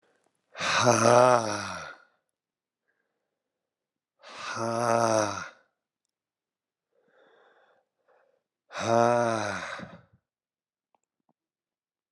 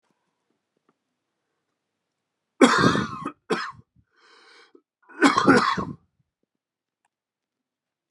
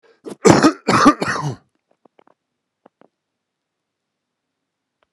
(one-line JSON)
{"exhalation_length": "12.1 s", "exhalation_amplitude": 17034, "exhalation_signal_mean_std_ratio": 0.35, "three_cough_length": "8.1 s", "three_cough_amplitude": 28114, "three_cough_signal_mean_std_ratio": 0.3, "cough_length": "5.1 s", "cough_amplitude": 32768, "cough_signal_mean_std_ratio": 0.28, "survey_phase": "beta (2021-08-13 to 2022-03-07)", "age": "45-64", "gender": "Male", "wearing_mask": "No", "symptom_cough_any": true, "symptom_runny_or_blocked_nose": true, "symptom_shortness_of_breath": true, "symptom_sore_throat": true, "symptom_fatigue": true, "symptom_fever_high_temperature": true, "symptom_change_to_sense_of_smell_or_taste": true, "symptom_loss_of_taste": true, "symptom_onset": "3 days", "smoker_status": "Ex-smoker", "respiratory_condition_asthma": false, "respiratory_condition_other": false, "recruitment_source": "Test and Trace", "submission_delay": "2 days", "covid_test_result": "Positive", "covid_test_method": "RT-qPCR", "covid_ct_value": 15.1, "covid_ct_gene": "ORF1ab gene", "covid_ct_mean": 15.4, "covid_viral_load": "8800000 copies/ml", "covid_viral_load_category": "High viral load (>1M copies/ml)"}